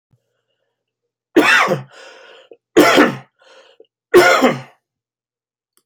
{"three_cough_length": "5.9 s", "three_cough_amplitude": 30522, "three_cough_signal_mean_std_ratio": 0.38, "survey_phase": "alpha (2021-03-01 to 2021-08-12)", "age": "45-64", "gender": "Male", "wearing_mask": "No", "symptom_none": true, "symptom_onset": "8 days", "smoker_status": "Never smoked", "respiratory_condition_asthma": true, "respiratory_condition_other": false, "recruitment_source": "REACT", "submission_delay": "2 days", "covid_test_result": "Negative", "covid_test_method": "RT-qPCR"}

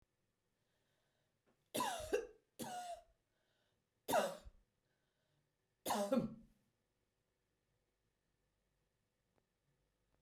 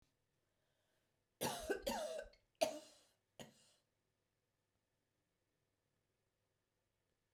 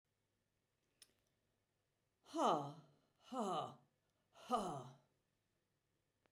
{"three_cough_length": "10.2 s", "three_cough_amplitude": 2224, "three_cough_signal_mean_std_ratio": 0.3, "cough_length": "7.3 s", "cough_amplitude": 2889, "cough_signal_mean_std_ratio": 0.28, "exhalation_length": "6.3 s", "exhalation_amplitude": 2215, "exhalation_signal_mean_std_ratio": 0.33, "survey_phase": "beta (2021-08-13 to 2022-03-07)", "age": "65+", "gender": "Female", "wearing_mask": "No", "symptom_none": true, "smoker_status": "Never smoked", "respiratory_condition_asthma": false, "respiratory_condition_other": false, "recruitment_source": "REACT", "submission_delay": "2 days", "covid_test_result": "Negative", "covid_test_method": "RT-qPCR", "influenza_a_test_result": "Negative", "influenza_b_test_result": "Negative"}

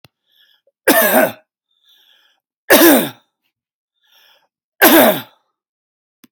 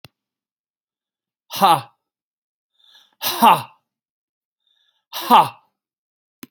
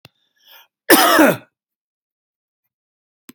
{"three_cough_length": "6.3 s", "three_cough_amplitude": 32768, "three_cough_signal_mean_std_ratio": 0.36, "exhalation_length": "6.5 s", "exhalation_amplitude": 30410, "exhalation_signal_mean_std_ratio": 0.26, "cough_length": "3.3 s", "cough_amplitude": 32768, "cough_signal_mean_std_ratio": 0.3, "survey_phase": "alpha (2021-03-01 to 2021-08-12)", "age": "65+", "gender": "Male", "wearing_mask": "No", "symptom_none": true, "smoker_status": "Never smoked", "respiratory_condition_asthma": false, "respiratory_condition_other": false, "recruitment_source": "REACT", "submission_delay": "3 days", "covid_test_result": "Negative", "covid_test_method": "RT-qPCR"}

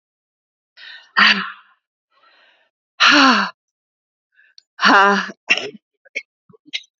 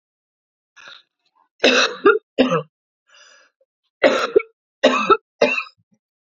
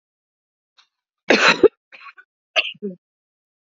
{"exhalation_length": "7.0 s", "exhalation_amplitude": 32528, "exhalation_signal_mean_std_ratio": 0.35, "three_cough_length": "6.4 s", "three_cough_amplitude": 29356, "three_cough_signal_mean_std_ratio": 0.36, "cough_length": "3.8 s", "cough_amplitude": 28924, "cough_signal_mean_std_ratio": 0.26, "survey_phase": "beta (2021-08-13 to 2022-03-07)", "age": "18-44", "gender": "Female", "wearing_mask": "No", "symptom_cough_any": true, "symptom_runny_or_blocked_nose": true, "symptom_sore_throat": true, "symptom_abdominal_pain": true, "symptom_diarrhoea": true, "symptom_fatigue": true, "symptom_headache": true, "symptom_other": true, "smoker_status": "Ex-smoker", "respiratory_condition_asthma": false, "respiratory_condition_other": false, "recruitment_source": "Test and Trace", "submission_delay": "1 day", "covid_test_result": "Positive", "covid_test_method": "LFT"}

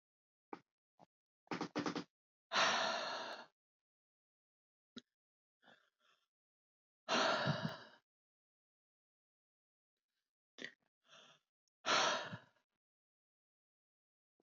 {"exhalation_length": "14.4 s", "exhalation_amplitude": 2830, "exhalation_signal_mean_std_ratio": 0.31, "survey_phase": "beta (2021-08-13 to 2022-03-07)", "age": "45-64", "gender": "Male", "wearing_mask": "No", "symptom_none": true, "smoker_status": "Never smoked", "respiratory_condition_asthma": false, "respiratory_condition_other": false, "recruitment_source": "REACT", "submission_delay": "1 day", "covid_test_result": "Negative", "covid_test_method": "RT-qPCR", "influenza_a_test_result": "Negative", "influenza_b_test_result": "Negative"}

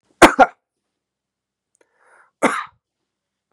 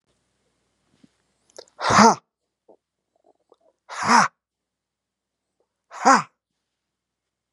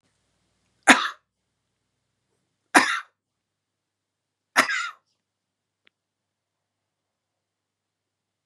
{"cough_length": "3.5 s", "cough_amplitude": 32768, "cough_signal_mean_std_ratio": 0.21, "exhalation_length": "7.5 s", "exhalation_amplitude": 31583, "exhalation_signal_mean_std_ratio": 0.24, "three_cough_length": "8.5 s", "three_cough_amplitude": 32767, "three_cough_signal_mean_std_ratio": 0.18, "survey_phase": "beta (2021-08-13 to 2022-03-07)", "age": "45-64", "gender": "Male", "wearing_mask": "No", "symptom_none": true, "smoker_status": "Never smoked", "respiratory_condition_asthma": true, "respiratory_condition_other": false, "recruitment_source": "REACT", "submission_delay": "2 days", "covid_test_result": "Negative", "covid_test_method": "RT-qPCR", "influenza_a_test_result": "Negative", "influenza_b_test_result": "Negative"}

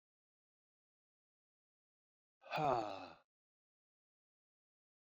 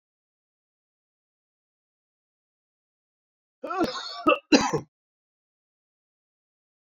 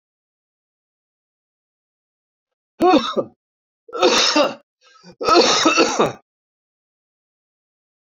{"exhalation_length": "5.0 s", "exhalation_amplitude": 2165, "exhalation_signal_mean_std_ratio": 0.24, "cough_length": "7.0 s", "cough_amplitude": 25230, "cough_signal_mean_std_ratio": 0.22, "three_cough_length": "8.2 s", "three_cough_amplitude": 29579, "three_cough_signal_mean_std_ratio": 0.38, "survey_phase": "beta (2021-08-13 to 2022-03-07)", "age": "65+", "gender": "Male", "wearing_mask": "No", "symptom_cough_any": true, "symptom_runny_or_blocked_nose": true, "symptom_fatigue": true, "symptom_change_to_sense_of_smell_or_taste": true, "symptom_loss_of_taste": true, "symptom_onset": "4 days", "smoker_status": "Never smoked", "respiratory_condition_asthma": false, "respiratory_condition_other": false, "recruitment_source": "Test and Trace", "submission_delay": "1 day", "covid_test_result": "Positive", "covid_test_method": "ePCR"}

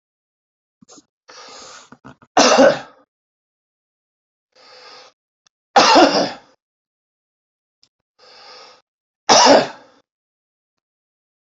{"three_cough_length": "11.4 s", "three_cough_amplitude": 32767, "three_cough_signal_mean_std_ratio": 0.28, "survey_phase": "beta (2021-08-13 to 2022-03-07)", "age": "65+", "gender": "Male", "wearing_mask": "No", "symptom_none": true, "smoker_status": "Ex-smoker", "respiratory_condition_asthma": false, "respiratory_condition_other": false, "recruitment_source": "REACT", "submission_delay": "1 day", "covid_test_result": "Negative", "covid_test_method": "RT-qPCR"}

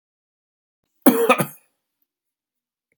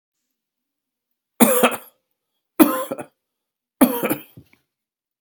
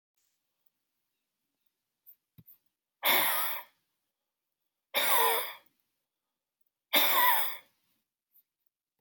{"cough_length": "3.0 s", "cough_amplitude": 32768, "cough_signal_mean_std_ratio": 0.25, "three_cough_length": "5.2 s", "three_cough_amplitude": 32768, "three_cough_signal_mean_std_ratio": 0.3, "exhalation_length": "9.0 s", "exhalation_amplitude": 12286, "exhalation_signal_mean_std_ratio": 0.35, "survey_phase": "beta (2021-08-13 to 2022-03-07)", "age": "65+", "gender": "Male", "wearing_mask": "No", "symptom_cough_any": true, "symptom_sore_throat": true, "symptom_fatigue": true, "smoker_status": "Never smoked", "respiratory_condition_asthma": false, "respiratory_condition_other": false, "recruitment_source": "Test and Trace", "submission_delay": "2 days", "covid_test_result": "Positive", "covid_test_method": "RT-qPCR", "covid_ct_value": 21.1, "covid_ct_gene": "ORF1ab gene", "covid_ct_mean": 21.7, "covid_viral_load": "78000 copies/ml", "covid_viral_load_category": "Low viral load (10K-1M copies/ml)"}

